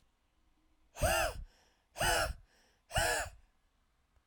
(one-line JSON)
{"exhalation_length": "4.3 s", "exhalation_amplitude": 4260, "exhalation_signal_mean_std_ratio": 0.43, "survey_phase": "alpha (2021-03-01 to 2021-08-12)", "age": "45-64", "gender": "Female", "wearing_mask": "No", "symptom_none": true, "smoker_status": "Never smoked", "respiratory_condition_asthma": false, "respiratory_condition_other": false, "recruitment_source": "REACT", "submission_delay": "1 day", "covid_test_result": "Negative", "covid_test_method": "RT-qPCR"}